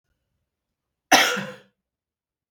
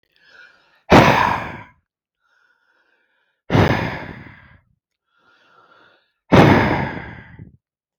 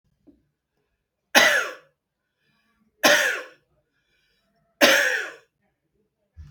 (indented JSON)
{
  "cough_length": "2.5 s",
  "cough_amplitude": 32731,
  "cough_signal_mean_std_ratio": 0.25,
  "exhalation_length": "8.0 s",
  "exhalation_amplitude": 32767,
  "exhalation_signal_mean_std_ratio": 0.34,
  "three_cough_length": "6.5 s",
  "three_cough_amplitude": 28271,
  "three_cough_signal_mean_std_ratio": 0.32,
  "survey_phase": "beta (2021-08-13 to 2022-03-07)",
  "age": "45-64",
  "gender": "Male",
  "wearing_mask": "No",
  "symptom_none": true,
  "smoker_status": "Ex-smoker",
  "respiratory_condition_asthma": false,
  "respiratory_condition_other": false,
  "recruitment_source": "REACT",
  "submission_delay": "6 days",
  "covid_test_result": "Negative",
  "covid_test_method": "RT-qPCR",
  "influenza_a_test_result": "Negative",
  "influenza_b_test_result": "Negative"
}